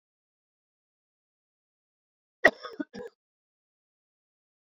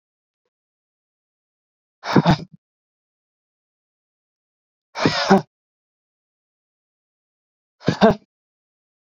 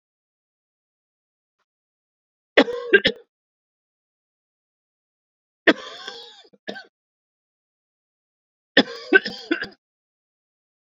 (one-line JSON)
{"cough_length": "4.7 s", "cough_amplitude": 22046, "cough_signal_mean_std_ratio": 0.11, "exhalation_length": "9.0 s", "exhalation_amplitude": 29367, "exhalation_signal_mean_std_ratio": 0.22, "three_cough_length": "10.8 s", "three_cough_amplitude": 29198, "three_cough_signal_mean_std_ratio": 0.19, "survey_phase": "beta (2021-08-13 to 2022-03-07)", "age": "18-44", "gender": "Male", "wearing_mask": "No", "symptom_cough_any": true, "symptom_runny_or_blocked_nose": true, "symptom_sore_throat": true, "symptom_fatigue": true, "smoker_status": "Never smoked", "respiratory_condition_asthma": false, "respiratory_condition_other": false, "recruitment_source": "Test and Trace", "submission_delay": "2 days", "covid_test_result": "Positive", "covid_test_method": "RT-qPCR", "covid_ct_value": 18.1, "covid_ct_gene": "ORF1ab gene", "covid_ct_mean": 19.2, "covid_viral_load": "510000 copies/ml", "covid_viral_load_category": "Low viral load (10K-1M copies/ml)"}